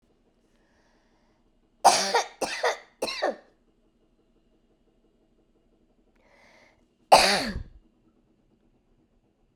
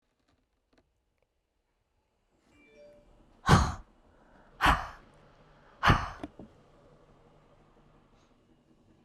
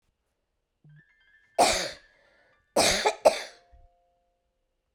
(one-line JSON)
{"three_cough_length": "9.6 s", "three_cough_amplitude": 26375, "three_cough_signal_mean_std_ratio": 0.26, "exhalation_length": "9.0 s", "exhalation_amplitude": 15215, "exhalation_signal_mean_std_ratio": 0.23, "cough_length": "4.9 s", "cough_amplitude": 18910, "cough_signal_mean_std_ratio": 0.31, "survey_phase": "beta (2021-08-13 to 2022-03-07)", "age": "65+", "gender": "Female", "wearing_mask": "No", "symptom_cough_any": true, "symptom_runny_or_blocked_nose": true, "symptom_change_to_sense_of_smell_or_taste": true, "symptom_loss_of_taste": true, "symptom_onset": "3 days", "smoker_status": "Never smoked", "respiratory_condition_asthma": false, "respiratory_condition_other": false, "recruitment_source": "Test and Trace", "submission_delay": "2 days", "covid_test_result": "Positive", "covid_test_method": "RT-qPCR", "covid_ct_value": 15.4, "covid_ct_gene": "ORF1ab gene", "covid_ct_mean": 15.7, "covid_viral_load": "7200000 copies/ml", "covid_viral_load_category": "High viral load (>1M copies/ml)"}